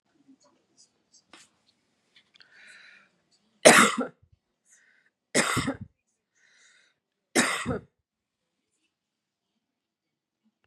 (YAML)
three_cough_length: 10.7 s
three_cough_amplitude: 32767
three_cough_signal_mean_std_ratio: 0.21
survey_phase: beta (2021-08-13 to 2022-03-07)
age: 45-64
gender: Female
wearing_mask: 'No'
symptom_headache: true
smoker_status: Never smoked
respiratory_condition_asthma: false
respiratory_condition_other: false
recruitment_source: REACT
submission_delay: 2 days
covid_test_result: Negative
covid_test_method: RT-qPCR
influenza_a_test_result: Negative
influenza_b_test_result: Negative